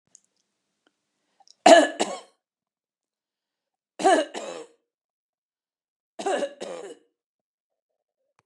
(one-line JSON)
{"three_cough_length": "8.5 s", "three_cough_amplitude": 29815, "three_cough_signal_mean_std_ratio": 0.23, "survey_phase": "beta (2021-08-13 to 2022-03-07)", "age": "65+", "gender": "Female", "wearing_mask": "No", "symptom_none": true, "smoker_status": "Never smoked", "respiratory_condition_asthma": false, "respiratory_condition_other": false, "recruitment_source": "REACT", "submission_delay": "2 days", "covid_test_result": "Negative", "covid_test_method": "RT-qPCR"}